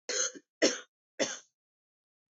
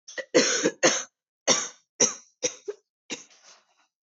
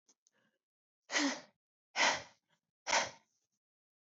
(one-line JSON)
{"three_cough_length": "2.3 s", "three_cough_amplitude": 9267, "three_cough_signal_mean_std_ratio": 0.35, "cough_length": "4.1 s", "cough_amplitude": 16113, "cough_signal_mean_std_ratio": 0.39, "exhalation_length": "4.1 s", "exhalation_amplitude": 5046, "exhalation_signal_mean_std_ratio": 0.32, "survey_phase": "beta (2021-08-13 to 2022-03-07)", "age": "18-44", "gender": "Female", "wearing_mask": "No", "symptom_cough_any": true, "symptom_new_continuous_cough": true, "symptom_runny_or_blocked_nose": true, "symptom_shortness_of_breath": true, "symptom_sore_throat": true, "symptom_fatigue": true, "symptom_fever_high_temperature": true, "symptom_headache": true, "smoker_status": "Never smoked", "respiratory_condition_asthma": true, "respiratory_condition_other": false, "recruitment_source": "Test and Trace", "submission_delay": "2 days", "covid_test_result": "Positive", "covid_test_method": "RT-qPCR", "covid_ct_value": 24.7, "covid_ct_gene": "ORF1ab gene", "covid_ct_mean": 25.3, "covid_viral_load": "5100 copies/ml", "covid_viral_load_category": "Minimal viral load (< 10K copies/ml)"}